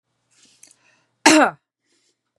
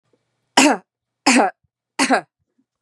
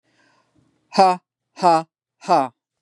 cough_length: 2.4 s
cough_amplitude: 32768
cough_signal_mean_std_ratio: 0.25
three_cough_length: 2.8 s
three_cough_amplitude: 32669
three_cough_signal_mean_std_ratio: 0.37
exhalation_length: 2.8 s
exhalation_amplitude: 31699
exhalation_signal_mean_std_ratio: 0.35
survey_phase: beta (2021-08-13 to 2022-03-07)
age: 45-64
gender: Female
wearing_mask: 'No'
symptom_none: true
smoker_status: Never smoked
respiratory_condition_asthma: false
respiratory_condition_other: false
recruitment_source: REACT
submission_delay: 2 days
covid_test_result: Negative
covid_test_method: RT-qPCR
influenza_a_test_result: Negative
influenza_b_test_result: Negative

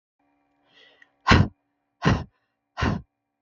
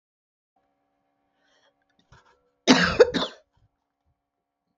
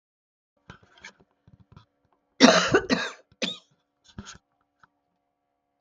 exhalation_length: 3.4 s
exhalation_amplitude: 23871
exhalation_signal_mean_std_ratio: 0.3
cough_length: 4.8 s
cough_amplitude: 31765
cough_signal_mean_std_ratio: 0.22
three_cough_length: 5.8 s
three_cough_amplitude: 31340
three_cough_signal_mean_std_ratio: 0.24
survey_phase: beta (2021-08-13 to 2022-03-07)
age: 45-64
gender: Female
wearing_mask: 'No'
symptom_none: true
smoker_status: Never smoked
respiratory_condition_asthma: false
respiratory_condition_other: false
recruitment_source: REACT
submission_delay: 1 day
covid_test_result: Negative
covid_test_method: RT-qPCR
influenza_a_test_result: Negative
influenza_b_test_result: Negative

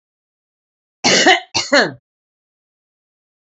cough_length: 3.4 s
cough_amplitude: 29555
cough_signal_mean_std_ratio: 0.34
survey_phase: beta (2021-08-13 to 2022-03-07)
age: 45-64
gender: Female
wearing_mask: 'No'
symptom_none: true
smoker_status: Never smoked
respiratory_condition_asthma: false
respiratory_condition_other: false
recruitment_source: Test and Trace
submission_delay: 1 day
covid_test_result: Negative
covid_test_method: RT-qPCR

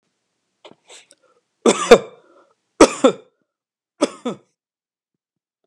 cough_length: 5.7 s
cough_amplitude: 32768
cough_signal_mean_std_ratio: 0.22
survey_phase: alpha (2021-03-01 to 2021-08-12)
age: 65+
gender: Male
wearing_mask: 'No'
symptom_none: true
smoker_status: Ex-smoker
respiratory_condition_asthma: false
respiratory_condition_other: false
recruitment_source: REACT
submission_delay: 2 days
covid_test_result: Negative
covid_test_method: RT-qPCR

